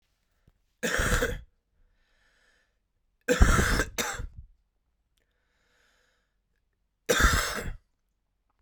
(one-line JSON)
{"three_cough_length": "8.6 s", "three_cough_amplitude": 24177, "three_cough_signal_mean_std_ratio": 0.35, "survey_phase": "beta (2021-08-13 to 2022-03-07)", "age": "18-44", "gender": "Male", "wearing_mask": "No", "symptom_cough_any": true, "symptom_loss_of_taste": true, "symptom_onset": "10 days", "smoker_status": "Never smoked", "respiratory_condition_asthma": false, "respiratory_condition_other": false, "recruitment_source": "Test and Trace", "submission_delay": "2 days", "covid_test_result": "Positive", "covid_test_method": "ePCR"}